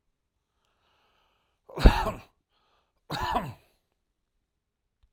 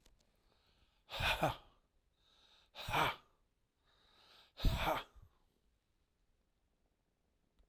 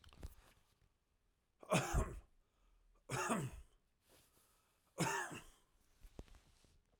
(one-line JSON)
{"cough_length": "5.1 s", "cough_amplitude": 25650, "cough_signal_mean_std_ratio": 0.21, "exhalation_length": "7.7 s", "exhalation_amplitude": 2906, "exhalation_signal_mean_std_ratio": 0.31, "three_cough_length": "7.0 s", "three_cough_amplitude": 2453, "three_cough_signal_mean_std_ratio": 0.37, "survey_phase": "alpha (2021-03-01 to 2021-08-12)", "age": "18-44", "gender": "Male", "wearing_mask": "No", "symptom_none": true, "symptom_onset": "12 days", "smoker_status": "Never smoked", "respiratory_condition_asthma": false, "respiratory_condition_other": false, "recruitment_source": "REACT", "submission_delay": "1 day", "covid_test_result": "Negative", "covid_test_method": "RT-qPCR"}